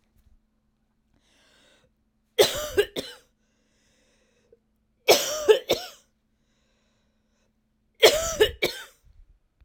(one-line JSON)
{"three_cough_length": "9.6 s", "three_cough_amplitude": 26177, "three_cough_signal_mean_std_ratio": 0.27, "survey_phase": "beta (2021-08-13 to 2022-03-07)", "age": "45-64", "gender": "Female", "wearing_mask": "No", "symptom_cough_any": true, "symptom_runny_or_blocked_nose": true, "symptom_sore_throat": true, "symptom_fatigue": true, "symptom_headache": true, "smoker_status": "Never smoked", "respiratory_condition_asthma": false, "respiratory_condition_other": false, "recruitment_source": "Test and Trace", "submission_delay": "1 day", "covid_test_result": "Positive", "covid_test_method": "LFT"}